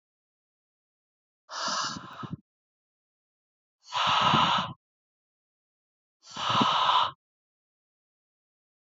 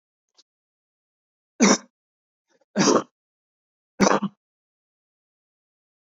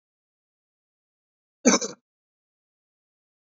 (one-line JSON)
{"exhalation_length": "8.9 s", "exhalation_amplitude": 10413, "exhalation_signal_mean_std_ratio": 0.38, "three_cough_length": "6.1 s", "three_cough_amplitude": 24772, "three_cough_signal_mean_std_ratio": 0.25, "cough_length": "3.5 s", "cough_amplitude": 21651, "cough_signal_mean_std_ratio": 0.16, "survey_phase": "beta (2021-08-13 to 2022-03-07)", "age": "18-44", "gender": "Male", "wearing_mask": "No", "symptom_none": true, "smoker_status": "Never smoked", "respiratory_condition_asthma": true, "respiratory_condition_other": false, "recruitment_source": "REACT", "submission_delay": "1 day", "covid_test_result": "Negative", "covid_test_method": "RT-qPCR", "influenza_a_test_result": "Negative", "influenza_b_test_result": "Negative"}